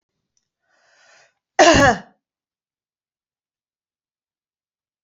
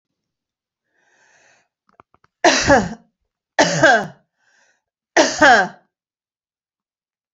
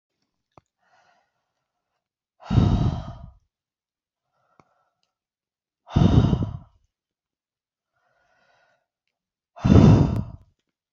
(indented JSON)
{
  "cough_length": "5.0 s",
  "cough_amplitude": 29058,
  "cough_signal_mean_std_ratio": 0.22,
  "three_cough_length": "7.3 s",
  "three_cough_amplitude": 32767,
  "three_cough_signal_mean_std_ratio": 0.33,
  "exhalation_length": "10.9 s",
  "exhalation_amplitude": 26698,
  "exhalation_signal_mean_std_ratio": 0.29,
  "survey_phase": "beta (2021-08-13 to 2022-03-07)",
  "age": "65+",
  "gender": "Female",
  "wearing_mask": "No",
  "symptom_none": true,
  "smoker_status": "Never smoked",
  "respiratory_condition_asthma": false,
  "respiratory_condition_other": false,
  "recruitment_source": "REACT",
  "submission_delay": "1 day",
  "covid_test_result": "Negative",
  "covid_test_method": "RT-qPCR"
}